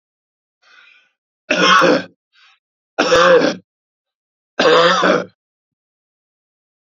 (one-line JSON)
{"three_cough_length": "6.8 s", "three_cough_amplitude": 32767, "three_cough_signal_mean_std_ratio": 0.42, "survey_phase": "alpha (2021-03-01 to 2021-08-12)", "age": "45-64", "gender": "Male", "wearing_mask": "No", "symptom_headache": true, "symptom_onset": "2 days", "smoker_status": "Ex-smoker", "respiratory_condition_asthma": false, "respiratory_condition_other": false, "recruitment_source": "Test and Trace", "submission_delay": "2 days", "covid_test_result": "Positive", "covid_test_method": "RT-qPCR", "covid_ct_value": 14.0, "covid_ct_gene": "ORF1ab gene", "covid_ct_mean": 14.4, "covid_viral_load": "19000000 copies/ml", "covid_viral_load_category": "High viral load (>1M copies/ml)"}